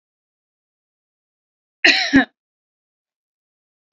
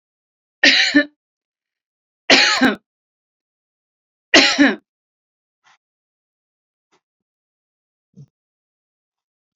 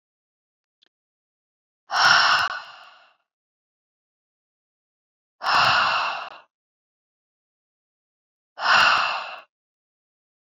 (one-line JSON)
{"cough_length": "3.9 s", "cough_amplitude": 32768, "cough_signal_mean_std_ratio": 0.22, "three_cough_length": "9.6 s", "three_cough_amplitude": 32768, "three_cough_signal_mean_std_ratio": 0.27, "exhalation_length": "10.6 s", "exhalation_amplitude": 24103, "exhalation_signal_mean_std_ratio": 0.35, "survey_phase": "beta (2021-08-13 to 2022-03-07)", "age": "18-44", "gender": "Female", "wearing_mask": "No", "symptom_none": true, "smoker_status": "Never smoked", "respiratory_condition_asthma": false, "respiratory_condition_other": false, "recruitment_source": "REACT", "submission_delay": "3 days", "covid_test_result": "Negative", "covid_test_method": "RT-qPCR"}